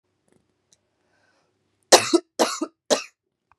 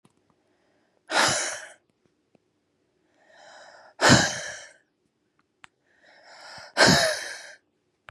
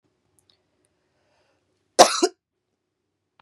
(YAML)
three_cough_length: 3.6 s
three_cough_amplitude: 32767
three_cough_signal_mean_std_ratio: 0.24
exhalation_length: 8.1 s
exhalation_amplitude: 22195
exhalation_signal_mean_std_ratio: 0.31
cough_length: 3.4 s
cough_amplitude: 32768
cough_signal_mean_std_ratio: 0.17
survey_phase: beta (2021-08-13 to 2022-03-07)
age: 18-44
gender: Female
wearing_mask: 'No'
symptom_cough_any: true
symptom_runny_or_blocked_nose: true
symptom_sore_throat: true
symptom_fatigue: true
symptom_headache: true
smoker_status: Ex-smoker
respiratory_condition_asthma: false
respiratory_condition_other: false
recruitment_source: Test and Trace
submission_delay: 2 days
covid_test_result: Positive
covid_test_method: LFT